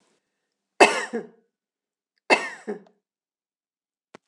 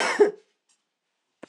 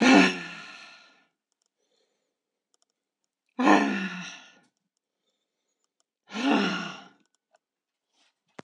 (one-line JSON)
{"three_cough_length": "4.3 s", "three_cough_amplitude": 26028, "three_cough_signal_mean_std_ratio": 0.22, "cough_length": "1.5 s", "cough_amplitude": 15303, "cough_signal_mean_std_ratio": 0.32, "exhalation_length": "8.6 s", "exhalation_amplitude": 18153, "exhalation_signal_mean_std_ratio": 0.31, "survey_phase": "beta (2021-08-13 to 2022-03-07)", "age": "65+", "gender": "Female", "wearing_mask": "No", "symptom_fatigue": true, "smoker_status": "Never smoked", "respiratory_condition_asthma": false, "respiratory_condition_other": false, "recruitment_source": "REACT", "submission_delay": "1 day", "covid_test_result": "Negative", "covid_test_method": "RT-qPCR"}